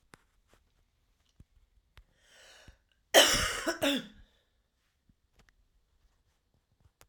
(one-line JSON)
{"cough_length": "7.1 s", "cough_amplitude": 16687, "cough_signal_mean_std_ratio": 0.23, "survey_phase": "alpha (2021-03-01 to 2021-08-12)", "age": "45-64", "gender": "Female", "wearing_mask": "No", "symptom_cough_any": true, "symptom_diarrhoea": true, "symptom_change_to_sense_of_smell_or_taste": true, "symptom_loss_of_taste": true, "smoker_status": "Ex-smoker", "respiratory_condition_asthma": false, "respiratory_condition_other": false, "recruitment_source": "Test and Trace", "submission_delay": "2 days", "covid_test_result": "Positive", "covid_test_method": "RT-qPCR", "covid_ct_value": 18.4, "covid_ct_gene": "ORF1ab gene", "covid_ct_mean": 22.3, "covid_viral_load": "50000 copies/ml", "covid_viral_load_category": "Low viral load (10K-1M copies/ml)"}